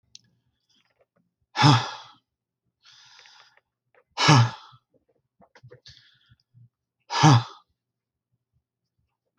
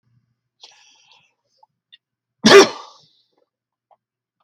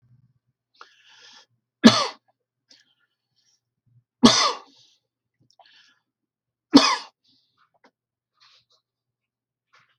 {"exhalation_length": "9.4 s", "exhalation_amplitude": 21800, "exhalation_signal_mean_std_ratio": 0.25, "cough_length": "4.4 s", "cough_amplitude": 32768, "cough_signal_mean_std_ratio": 0.19, "three_cough_length": "10.0 s", "three_cough_amplitude": 32768, "three_cough_signal_mean_std_ratio": 0.19, "survey_phase": "beta (2021-08-13 to 2022-03-07)", "age": "65+", "gender": "Male", "wearing_mask": "No", "symptom_none": true, "smoker_status": "Ex-smoker", "respiratory_condition_asthma": false, "respiratory_condition_other": false, "recruitment_source": "REACT", "submission_delay": "1 day", "covid_test_result": "Negative", "covid_test_method": "RT-qPCR", "influenza_a_test_result": "Negative", "influenza_b_test_result": "Negative"}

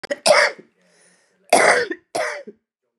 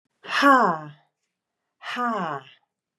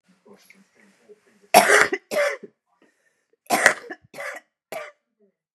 {"cough_length": "3.0 s", "cough_amplitude": 32562, "cough_signal_mean_std_ratio": 0.43, "exhalation_length": "3.0 s", "exhalation_amplitude": 22416, "exhalation_signal_mean_std_ratio": 0.4, "three_cough_length": "5.5 s", "three_cough_amplitude": 32768, "three_cough_signal_mean_std_ratio": 0.3, "survey_phase": "beta (2021-08-13 to 2022-03-07)", "age": "45-64", "gender": "Female", "wearing_mask": "No", "symptom_cough_any": true, "symptom_runny_or_blocked_nose": true, "symptom_sore_throat": true, "symptom_fatigue": true, "symptom_change_to_sense_of_smell_or_taste": true, "symptom_loss_of_taste": true, "symptom_onset": "5 days", "smoker_status": "Ex-smoker", "respiratory_condition_asthma": true, "respiratory_condition_other": false, "recruitment_source": "Test and Trace", "submission_delay": "1 day", "covid_test_result": "Positive", "covid_test_method": "ePCR"}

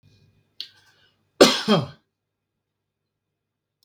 {"cough_length": "3.8 s", "cough_amplitude": 32768, "cough_signal_mean_std_ratio": 0.22, "survey_phase": "beta (2021-08-13 to 2022-03-07)", "age": "45-64", "gender": "Male", "wearing_mask": "No", "symptom_none": true, "smoker_status": "Never smoked", "respiratory_condition_asthma": true, "respiratory_condition_other": false, "recruitment_source": "REACT", "submission_delay": "1 day", "covid_test_result": "Negative", "covid_test_method": "RT-qPCR", "influenza_a_test_result": "Negative", "influenza_b_test_result": "Negative"}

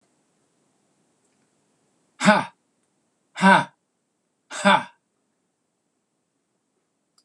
{"exhalation_length": "7.2 s", "exhalation_amplitude": 25307, "exhalation_signal_mean_std_ratio": 0.23, "survey_phase": "beta (2021-08-13 to 2022-03-07)", "age": "65+", "gender": "Male", "wearing_mask": "No", "symptom_none": true, "smoker_status": "Never smoked", "respiratory_condition_asthma": false, "respiratory_condition_other": false, "recruitment_source": "REACT", "submission_delay": "1 day", "covid_test_result": "Negative", "covid_test_method": "RT-qPCR"}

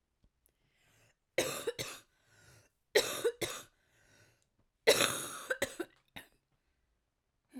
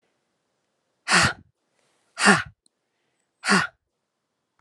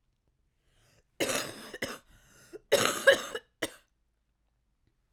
{"three_cough_length": "7.6 s", "three_cough_amplitude": 9669, "three_cough_signal_mean_std_ratio": 0.31, "exhalation_length": "4.6 s", "exhalation_amplitude": 30490, "exhalation_signal_mean_std_ratio": 0.29, "cough_length": "5.1 s", "cough_amplitude": 15097, "cough_signal_mean_std_ratio": 0.29, "survey_phase": "alpha (2021-03-01 to 2021-08-12)", "age": "18-44", "gender": "Female", "wearing_mask": "No", "symptom_cough_any": true, "symptom_diarrhoea": true, "symptom_fatigue": true, "symptom_fever_high_temperature": true, "symptom_headache": true, "symptom_change_to_sense_of_smell_or_taste": true, "smoker_status": "Never smoked", "respiratory_condition_asthma": false, "respiratory_condition_other": false, "recruitment_source": "Test and Trace", "submission_delay": "2 days", "covid_test_result": "Positive", "covid_test_method": "RT-qPCR", "covid_ct_value": 16.2, "covid_ct_gene": "ORF1ab gene", "covid_ct_mean": 16.4, "covid_viral_load": "4100000 copies/ml", "covid_viral_load_category": "High viral load (>1M copies/ml)"}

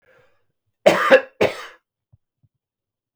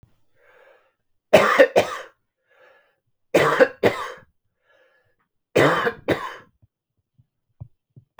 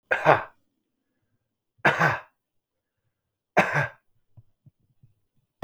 {"cough_length": "3.2 s", "cough_amplitude": 32768, "cough_signal_mean_std_ratio": 0.28, "three_cough_length": "8.2 s", "three_cough_amplitude": 32056, "three_cough_signal_mean_std_ratio": 0.32, "exhalation_length": "5.6 s", "exhalation_amplitude": 24174, "exhalation_signal_mean_std_ratio": 0.29, "survey_phase": "beta (2021-08-13 to 2022-03-07)", "age": "45-64", "gender": "Male", "wearing_mask": "No", "symptom_cough_any": true, "symptom_shortness_of_breath": true, "symptom_abdominal_pain": true, "symptom_fatigue": true, "symptom_headache": true, "symptom_onset": "4 days", "smoker_status": "Current smoker (1 to 10 cigarettes per day)", "respiratory_condition_asthma": false, "respiratory_condition_other": false, "recruitment_source": "Test and Trace", "submission_delay": "2 days", "covid_test_result": "Positive", "covid_test_method": "ePCR"}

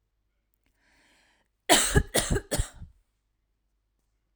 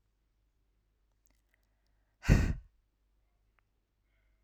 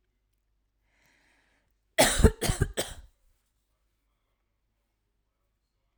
{"cough_length": "4.4 s", "cough_amplitude": 24071, "cough_signal_mean_std_ratio": 0.3, "exhalation_length": "4.4 s", "exhalation_amplitude": 11006, "exhalation_signal_mean_std_ratio": 0.19, "three_cough_length": "6.0 s", "three_cough_amplitude": 18482, "three_cough_signal_mean_std_ratio": 0.22, "survey_phase": "alpha (2021-03-01 to 2021-08-12)", "age": "18-44", "gender": "Female", "wearing_mask": "No", "symptom_none": true, "smoker_status": "Never smoked", "respiratory_condition_asthma": true, "respiratory_condition_other": false, "recruitment_source": "REACT", "submission_delay": "1 day", "covid_test_result": "Negative", "covid_test_method": "RT-qPCR"}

